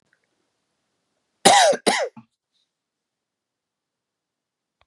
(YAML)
cough_length: 4.9 s
cough_amplitude: 32767
cough_signal_mean_std_ratio: 0.25
survey_phase: beta (2021-08-13 to 2022-03-07)
age: 45-64
gender: Male
wearing_mask: 'No'
symptom_cough_any: true
symptom_runny_or_blocked_nose: true
symptom_sore_throat: true
symptom_headache: true
symptom_change_to_sense_of_smell_or_taste: true
symptom_loss_of_taste: true
symptom_onset: 4 days
smoker_status: Never smoked
respiratory_condition_asthma: false
respiratory_condition_other: false
recruitment_source: Test and Trace
submission_delay: 2 days
covid_test_result: Positive
covid_test_method: RT-qPCR
covid_ct_value: 19.1
covid_ct_gene: ORF1ab gene